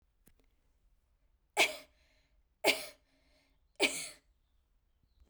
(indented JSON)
{
  "three_cough_length": "5.3 s",
  "three_cough_amplitude": 6398,
  "three_cough_signal_mean_std_ratio": 0.25,
  "survey_phase": "beta (2021-08-13 to 2022-03-07)",
  "age": "18-44",
  "gender": "Female",
  "wearing_mask": "No",
  "symptom_none": true,
  "smoker_status": "Never smoked",
  "respiratory_condition_asthma": false,
  "respiratory_condition_other": false,
  "recruitment_source": "REACT",
  "submission_delay": "1 day",
  "covid_test_result": "Negative",
  "covid_test_method": "RT-qPCR"
}